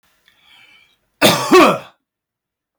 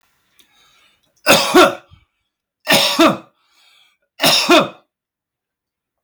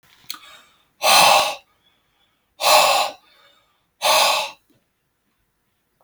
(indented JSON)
{
  "cough_length": "2.8 s",
  "cough_amplitude": 32768,
  "cough_signal_mean_std_ratio": 0.35,
  "three_cough_length": "6.0 s",
  "three_cough_amplitude": 32767,
  "three_cough_signal_mean_std_ratio": 0.39,
  "exhalation_length": "6.0 s",
  "exhalation_amplitude": 32212,
  "exhalation_signal_mean_std_ratio": 0.4,
  "survey_phase": "beta (2021-08-13 to 2022-03-07)",
  "age": "45-64",
  "gender": "Male",
  "wearing_mask": "No",
  "symptom_runny_or_blocked_nose": true,
  "smoker_status": "Ex-smoker",
  "respiratory_condition_asthma": false,
  "respiratory_condition_other": false,
  "recruitment_source": "Test and Trace",
  "submission_delay": "2 days",
  "covid_test_result": "Positive",
  "covid_test_method": "RT-qPCR",
  "covid_ct_value": 18.9,
  "covid_ct_gene": "ORF1ab gene",
  "covid_ct_mean": 19.5,
  "covid_viral_load": "420000 copies/ml",
  "covid_viral_load_category": "Low viral load (10K-1M copies/ml)"
}